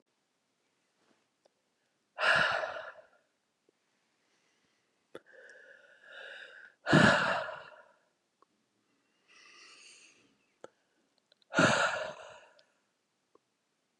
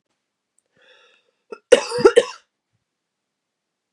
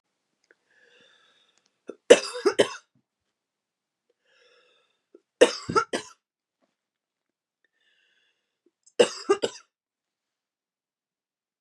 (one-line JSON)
{"exhalation_length": "14.0 s", "exhalation_amplitude": 9342, "exhalation_signal_mean_std_ratio": 0.28, "cough_length": "3.9 s", "cough_amplitude": 32768, "cough_signal_mean_std_ratio": 0.21, "three_cough_length": "11.6 s", "three_cough_amplitude": 31514, "three_cough_signal_mean_std_ratio": 0.18, "survey_phase": "beta (2021-08-13 to 2022-03-07)", "age": "45-64", "gender": "Female", "wearing_mask": "No", "symptom_cough_any": true, "symptom_runny_or_blocked_nose": true, "symptom_shortness_of_breath": true, "symptom_sore_throat": true, "symptom_fatigue": true, "symptom_fever_high_temperature": true, "symptom_headache": true, "smoker_status": "Never smoked", "respiratory_condition_asthma": false, "respiratory_condition_other": false, "recruitment_source": "Test and Trace", "submission_delay": "2 days", "covid_test_result": "Positive", "covid_test_method": "LFT"}